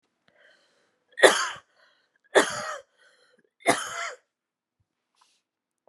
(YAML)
three_cough_length: 5.9 s
three_cough_amplitude: 32587
three_cough_signal_mean_std_ratio: 0.25
survey_phase: beta (2021-08-13 to 2022-03-07)
age: 45-64
gender: Female
wearing_mask: 'No'
symptom_cough_any: true
symptom_runny_or_blocked_nose: true
symptom_shortness_of_breath: true
symptom_fatigue: true
symptom_headache: true
symptom_change_to_sense_of_smell_or_taste: true
symptom_onset: 7 days
smoker_status: Never smoked
respiratory_condition_asthma: false
respiratory_condition_other: false
recruitment_source: Test and Trace
submission_delay: 2 days
covid_test_result: Positive
covid_test_method: RT-qPCR
covid_ct_value: 17.5
covid_ct_gene: ORF1ab gene
covid_ct_mean: 19.1
covid_viral_load: 550000 copies/ml
covid_viral_load_category: Low viral load (10K-1M copies/ml)